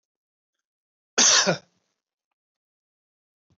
{"cough_length": "3.6 s", "cough_amplitude": 16415, "cough_signal_mean_std_ratio": 0.25, "survey_phase": "beta (2021-08-13 to 2022-03-07)", "age": "65+", "gender": "Male", "wearing_mask": "No", "symptom_none": true, "smoker_status": "Never smoked", "respiratory_condition_asthma": false, "respiratory_condition_other": false, "recruitment_source": "REACT", "submission_delay": "5 days", "covid_test_result": "Negative", "covid_test_method": "RT-qPCR", "influenza_a_test_result": "Negative", "influenza_b_test_result": "Negative"}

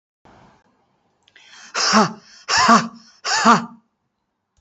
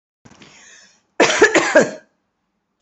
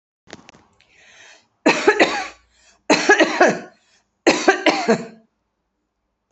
{"exhalation_length": "4.6 s", "exhalation_amplitude": 28060, "exhalation_signal_mean_std_ratio": 0.39, "cough_length": "2.8 s", "cough_amplitude": 30852, "cough_signal_mean_std_ratio": 0.37, "three_cough_length": "6.3 s", "three_cough_amplitude": 28951, "three_cough_signal_mean_std_ratio": 0.4, "survey_phase": "beta (2021-08-13 to 2022-03-07)", "age": "65+", "gender": "Female", "wearing_mask": "No", "symptom_none": true, "symptom_onset": "12 days", "smoker_status": "Never smoked", "respiratory_condition_asthma": false, "respiratory_condition_other": false, "recruitment_source": "REACT", "submission_delay": "3 days", "covid_test_result": "Negative", "covid_test_method": "RT-qPCR"}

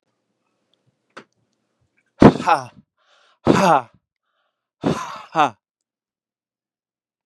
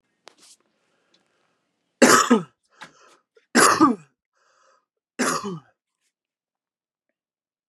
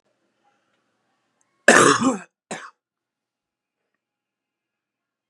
{"exhalation_length": "7.3 s", "exhalation_amplitude": 32768, "exhalation_signal_mean_std_ratio": 0.25, "three_cough_length": "7.7 s", "three_cough_amplitude": 30576, "three_cough_signal_mean_std_ratio": 0.28, "cough_length": "5.3 s", "cough_amplitude": 32768, "cough_signal_mean_std_ratio": 0.23, "survey_phase": "beta (2021-08-13 to 2022-03-07)", "age": "18-44", "gender": "Male", "wearing_mask": "No", "symptom_sore_throat": true, "symptom_fatigue": true, "symptom_headache": true, "smoker_status": "Current smoker (e-cigarettes or vapes only)", "respiratory_condition_asthma": false, "respiratory_condition_other": false, "recruitment_source": "Test and Trace", "submission_delay": "1 day", "covid_test_result": "Positive", "covid_test_method": "LFT"}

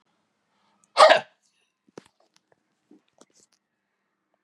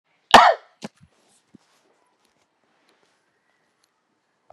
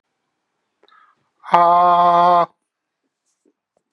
{"cough_length": "4.4 s", "cough_amplitude": 32231, "cough_signal_mean_std_ratio": 0.17, "three_cough_length": "4.5 s", "three_cough_amplitude": 32768, "three_cough_signal_mean_std_ratio": 0.16, "exhalation_length": "3.9 s", "exhalation_amplitude": 32768, "exhalation_signal_mean_std_ratio": 0.41, "survey_phase": "beta (2021-08-13 to 2022-03-07)", "age": "65+", "gender": "Male", "wearing_mask": "No", "symptom_none": true, "smoker_status": "Never smoked", "respiratory_condition_asthma": false, "respiratory_condition_other": false, "recruitment_source": "REACT", "submission_delay": "6 days", "covid_test_result": "Negative", "covid_test_method": "RT-qPCR", "influenza_a_test_result": "Negative", "influenza_b_test_result": "Negative"}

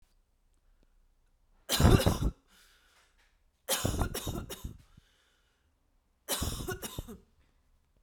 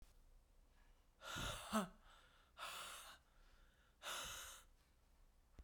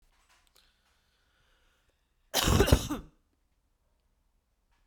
{"three_cough_length": "8.0 s", "three_cough_amplitude": 13254, "three_cough_signal_mean_std_ratio": 0.33, "exhalation_length": "5.6 s", "exhalation_amplitude": 1423, "exhalation_signal_mean_std_ratio": 0.49, "cough_length": "4.9 s", "cough_amplitude": 14388, "cough_signal_mean_std_ratio": 0.25, "survey_phase": "beta (2021-08-13 to 2022-03-07)", "age": "18-44", "gender": "Female", "wearing_mask": "No", "symptom_cough_any": true, "symptom_new_continuous_cough": true, "symptom_runny_or_blocked_nose": true, "symptom_fatigue": true, "symptom_headache": true, "symptom_change_to_sense_of_smell_or_taste": true, "symptom_loss_of_taste": true, "symptom_onset": "2 days", "smoker_status": "Ex-smoker", "respiratory_condition_asthma": false, "respiratory_condition_other": false, "recruitment_source": "Test and Trace", "submission_delay": "2 days", "covid_test_result": "Positive", "covid_test_method": "RT-qPCR"}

